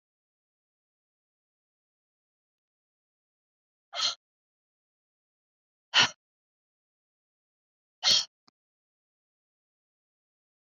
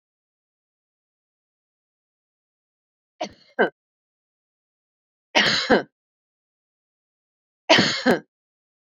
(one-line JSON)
{"exhalation_length": "10.8 s", "exhalation_amplitude": 12634, "exhalation_signal_mean_std_ratio": 0.16, "three_cough_length": "9.0 s", "three_cough_amplitude": 28414, "three_cough_signal_mean_std_ratio": 0.24, "survey_phase": "beta (2021-08-13 to 2022-03-07)", "age": "65+", "gender": "Female", "wearing_mask": "No", "symptom_none": true, "smoker_status": "Never smoked", "respiratory_condition_asthma": false, "respiratory_condition_other": false, "recruitment_source": "Test and Trace", "submission_delay": "0 days", "covid_test_result": "Negative", "covid_test_method": "LFT"}